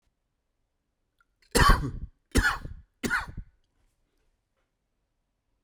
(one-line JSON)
{"three_cough_length": "5.6 s", "three_cough_amplitude": 16110, "three_cough_signal_mean_std_ratio": 0.29, "survey_phase": "beta (2021-08-13 to 2022-03-07)", "age": "18-44", "gender": "Male", "wearing_mask": "No", "symptom_cough_any": true, "symptom_runny_or_blocked_nose": true, "symptom_change_to_sense_of_smell_or_taste": true, "smoker_status": "Current smoker (e-cigarettes or vapes only)", "respiratory_condition_asthma": false, "respiratory_condition_other": false, "recruitment_source": "Test and Trace", "submission_delay": "1 day", "covid_test_result": "Positive", "covid_test_method": "RT-qPCR", "covid_ct_value": 33.9, "covid_ct_gene": "ORF1ab gene"}